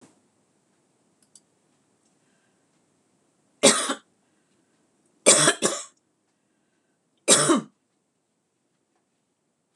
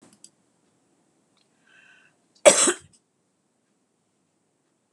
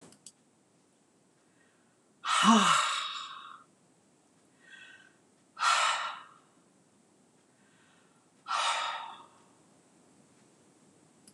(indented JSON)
{
  "three_cough_length": "9.8 s",
  "three_cough_amplitude": 25973,
  "three_cough_signal_mean_std_ratio": 0.24,
  "cough_length": "4.9 s",
  "cough_amplitude": 26027,
  "cough_signal_mean_std_ratio": 0.17,
  "exhalation_length": "11.3 s",
  "exhalation_amplitude": 10808,
  "exhalation_signal_mean_std_ratio": 0.34,
  "survey_phase": "beta (2021-08-13 to 2022-03-07)",
  "age": "65+",
  "gender": "Female",
  "wearing_mask": "No",
  "symptom_none": true,
  "smoker_status": "Ex-smoker",
  "respiratory_condition_asthma": false,
  "respiratory_condition_other": false,
  "recruitment_source": "REACT",
  "submission_delay": "2 days",
  "covid_test_result": "Negative",
  "covid_test_method": "RT-qPCR",
  "influenza_a_test_result": "Negative",
  "influenza_b_test_result": "Negative"
}